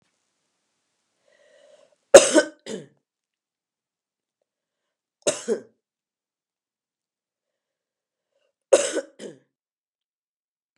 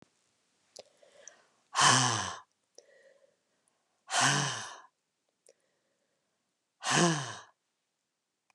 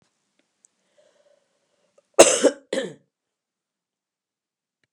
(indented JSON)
{
  "three_cough_length": "10.8 s",
  "three_cough_amplitude": 32768,
  "three_cough_signal_mean_std_ratio": 0.16,
  "exhalation_length": "8.5 s",
  "exhalation_amplitude": 10699,
  "exhalation_signal_mean_std_ratio": 0.33,
  "cough_length": "4.9 s",
  "cough_amplitude": 32768,
  "cough_signal_mean_std_ratio": 0.19,
  "survey_phase": "beta (2021-08-13 to 2022-03-07)",
  "age": "65+",
  "gender": "Female",
  "wearing_mask": "No",
  "symptom_fatigue": true,
  "symptom_headache": true,
  "smoker_status": "Never smoked",
  "respiratory_condition_asthma": false,
  "respiratory_condition_other": false,
  "recruitment_source": "Test and Trace",
  "submission_delay": "2 days",
  "covid_test_result": "Positive",
  "covid_test_method": "RT-qPCR",
  "covid_ct_value": 19.2,
  "covid_ct_gene": "N gene",
  "covid_ct_mean": 19.5,
  "covid_viral_load": "390000 copies/ml",
  "covid_viral_load_category": "Low viral load (10K-1M copies/ml)"
}